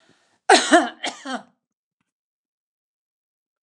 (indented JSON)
{
  "cough_length": "3.6 s",
  "cough_amplitude": 29203,
  "cough_signal_mean_std_ratio": 0.25,
  "survey_phase": "alpha (2021-03-01 to 2021-08-12)",
  "age": "65+",
  "gender": "Female",
  "wearing_mask": "No",
  "symptom_none": true,
  "smoker_status": "Never smoked",
  "respiratory_condition_asthma": false,
  "respiratory_condition_other": false,
  "recruitment_source": "REACT",
  "submission_delay": "1 day",
  "covid_test_result": "Negative",
  "covid_test_method": "RT-qPCR"
}